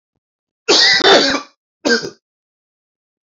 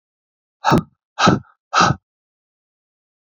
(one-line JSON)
{"cough_length": "3.2 s", "cough_amplitude": 32528, "cough_signal_mean_std_ratio": 0.43, "exhalation_length": "3.3 s", "exhalation_amplitude": 30534, "exhalation_signal_mean_std_ratio": 0.33, "survey_phase": "alpha (2021-03-01 to 2021-08-12)", "age": "18-44", "gender": "Male", "wearing_mask": "No", "symptom_cough_any": true, "symptom_new_continuous_cough": true, "symptom_shortness_of_breath": true, "symptom_fatigue": true, "symptom_change_to_sense_of_smell_or_taste": true, "symptom_loss_of_taste": true, "symptom_onset": "4 days", "smoker_status": "Ex-smoker", "respiratory_condition_asthma": false, "respiratory_condition_other": false, "recruitment_source": "Test and Trace", "submission_delay": "2 days", "covid_test_result": "Positive", "covid_test_method": "RT-qPCR"}